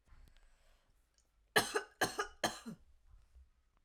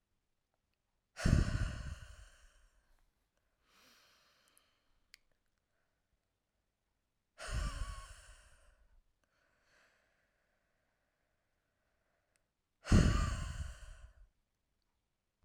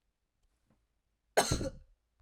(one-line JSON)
{"three_cough_length": "3.8 s", "three_cough_amplitude": 5801, "three_cough_signal_mean_std_ratio": 0.3, "exhalation_length": "15.4 s", "exhalation_amplitude": 6668, "exhalation_signal_mean_std_ratio": 0.25, "cough_length": "2.2 s", "cough_amplitude": 7503, "cough_signal_mean_std_ratio": 0.27, "survey_phase": "alpha (2021-03-01 to 2021-08-12)", "age": "18-44", "gender": "Female", "wearing_mask": "No", "symptom_headache": true, "smoker_status": "Never smoked", "respiratory_condition_asthma": true, "respiratory_condition_other": false, "recruitment_source": "Test and Trace", "submission_delay": "2 days", "covid_test_result": "Positive", "covid_test_method": "RT-qPCR"}